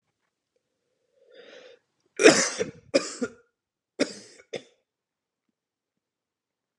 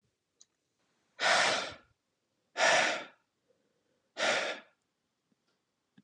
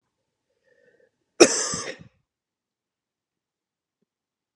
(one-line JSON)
{"three_cough_length": "6.8 s", "three_cough_amplitude": 28790, "three_cough_signal_mean_std_ratio": 0.21, "exhalation_length": "6.0 s", "exhalation_amplitude": 7507, "exhalation_signal_mean_std_ratio": 0.37, "cough_length": "4.6 s", "cough_amplitude": 32669, "cough_signal_mean_std_ratio": 0.17, "survey_phase": "beta (2021-08-13 to 2022-03-07)", "age": "18-44", "gender": "Male", "wearing_mask": "No", "symptom_runny_or_blocked_nose": true, "symptom_sore_throat": true, "symptom_fatigue": true, "symptom_headache": true, "smoker_status": "Ex-smoker", "respiratory_condition_asthma": false, "respiratory_condition_other": false, "recruitment_source": "Test and Trace", "submission_delay": "2 days", "covid_test_result": "Positive", "covid_test_method": "RT-qPCR", "covid_ct_value": 23.4, "covid_ct_gene": "ORF1ab gene", "covid_ct_mean": 23.9, "covid_viral_load": "14000 copies/ml", "covid_viral_load_category": "Low viral load (10K-1M copies/ml)"}